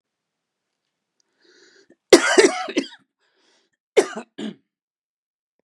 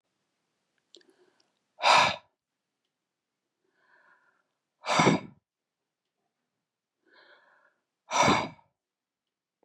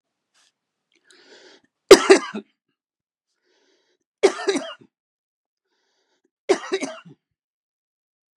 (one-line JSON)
{"cough_length": "5.6 s", "cough_amplitude": 32768, "cough_signal_mean_std_ratio": 0.24, "exhalation_length": "9.6 s", "exhalation_amplitude": 13172, "exhalation_signal_mean_std_ratio": 0.25, "three_cough_length": "8.4 s", "three_cough_amplitude": 32768, "three_cough_signal_mean_std_ratio": 0.19, "survey_phase": "beta (2021-08-13 to 2022-03-07)", "age": "45-64", "gender": "Male", "wearing_mask": "No", "symptom_none": true, "smoker_status": "Never smoked", "respiratory_condition_asthma": false, "respiratory_condition_other": false, "recruitment_source": "REACT", "submission_delay": "2 days", "covid_test_result": "Negative", "covid_test_method": "RT-qPCR", "influenza_a_test_result": "Negative", "influenza_b_test_result": "Negative"}